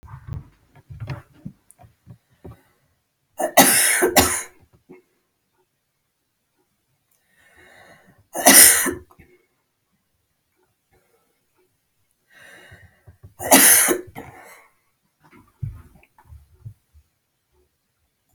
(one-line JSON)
{"three_cough_length": "18.3 s", "three_cough_amplitude": 32768, "three_cough_signal_mean_std_ratio": 0.26, "survey_phase": "beta (2021-08-13 to 2022-03-07)", "age": "65+", "gender": "Female", "wearing_mask": "No", "symptom_none": true, "smoker_status": "Never smoked", "respiratory_condition_asthma": true, "respiratory_condition_other": false, "recruitment_source": "REACT", "submission_delay": "1 day", "covid_test_result": "Negative", "covid_test_method": "RT-qPCR"}